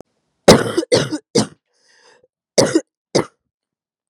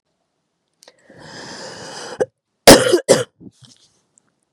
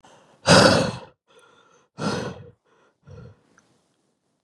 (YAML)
three_cough_length: 4.1 s
three_cough_amplitude: 32768
three_cough_signal_mean_std_ratio: 0.33
cough_length: 4.5 s
cough_amplitude: 32768
cough_signal_mean_std_ratio: 0.26
exhalation_length: 4.4 s
exhalation_amplitude: 29725
exhalation_signal_mean_std_ratio: 0.3
survey_phase: beta (2021-08-13 to 2022-03-07)
age: 18-44
gender: Female
wearing_mask: 'No'
symptom_cough_any: true
symptom_new_continuous_cough: true
symptom_runny_or_blocked_nose: true
symptom_shortness_of_breath: true
symptom_sore_throat: true
symptom_fatigue: true
symptom_fever_high_temperature: true
symptom_change_to_sense_of_smell_or_taste: true
symptom_loss_of_taste: true
symptom_onset: 3 days
smoker_status: Never smoked
respiratory_condition_asthma: true
respiratory_condition_other: false
recruitment_source: Test and Trace
submission_delay: 2 days
covid_test_result: Positive
covid_test_method: RT-qPCR
covid_ct_value: 21.0
covid_ct_gene: ORF1ab gene
covid_ct_mean: 21.3
covid_viral_load: 100000 copies/ml
covid_viral_load_category: Low viral load (10K-1M copies/ml)